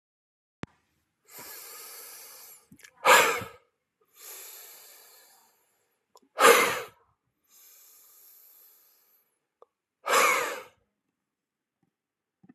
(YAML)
exhalation_length: 12.5 s
exhalation_amplitude: 21931
exhalation_signal_mean_std_ratio: 0.26
survey_phase: alpha (2021-03-01 to 2021-08-12)
age: 45-64
gender: Male
wearing_mask: 'No'
symptom_none: true
smoker_status: Never smoked
respiratory_condition_asthma: false
respiratory_condition_other: false
recruitment_source: REACT
submission_delay: 2 days
covid_test_result: Negative
covid_test_method: RT-qPCR